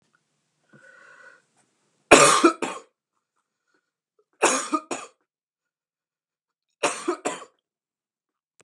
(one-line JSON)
{"three_cough_length": "8.6 s", "three_cough_amplitude": 32767, "three_cough_signal_mean_std_ratio": 0.25, "survey_phase": "beta (2021-08-13 to 2022-03-07)", "age": "18-44", "gender": "Male", "wearing_mask": "No", "symptom_cough_any": true, "symptom_fatigue": true, "smoker_status": "Current smoker (e-cigarettes or vapes only)", "respiratory_condition_asthma": false, "respiratory_condition_other": false, "recruitment_source": "Test and Trace", "submission_delay": "1 day", "covid_test_result": "Negative", "covid_test_method": "RT-qPCR"}